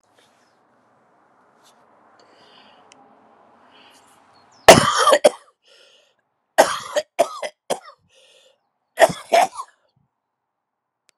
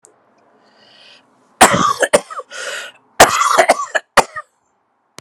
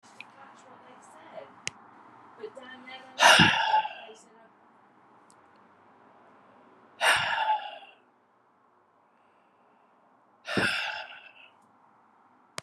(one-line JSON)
{"three_cough_length": "11.2 s", "three_cough_amplitude": 32768, "three_cough_signal_mean_std_ratio": 0.24, "cough_length": "5.2 s", "cough_amplitude": 32768, "cough_signal_mean_std_ratio": 0.38, "exhalation_length": "12.6 s", "exhalation_amplitude": 18467, "exhalation_signal_mean_std_ratio": 0.32, "survey_phase": "beta (2021-08-13 to 2022-03-07)", "age": "65+", "gender": "Male", "wearing_mask": "No", "symptom_new_continuous_cough": true, "symptom_fatigue": true, "symptom_headache": true, "symptom_onset": "3 days", "smoker_status": "Never smoked", "respiratory_condition_asthma": false, "respiratory_condition_other": false, "recruitment_source": "Test and Trace", "submission_delay": "2 days", "covid_test_result": "Positive", "covid_test_method": "RT-qPCR", "covid_ct_value": 28.7, "covid_ct_gene": "ORF1ab gene"}